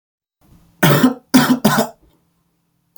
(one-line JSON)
{"three_cough_length": "3.0 s", "three_cough_amplitude": 32768, "three_cough_signal_mean_std_ratio": 0.42, "survey_phase": "beta (2021-08-13 to 2022-03-07)", "age": "18-44", "gender": "Male", "wearing_mask": "No", "symptom_cough_any": true, "symptom_runny_or_blocked_nose": true, "symptom_onset": "2 days", "smoker_status": "Never smoked", "respiratory_condition_asthma": false, "respiratory_condition_other": false, "recruitment_source": "Test and Trace", "submission_delay": "1 day", "covid_test_result": "Negative", "covid_test_method": "RT-qPCR"}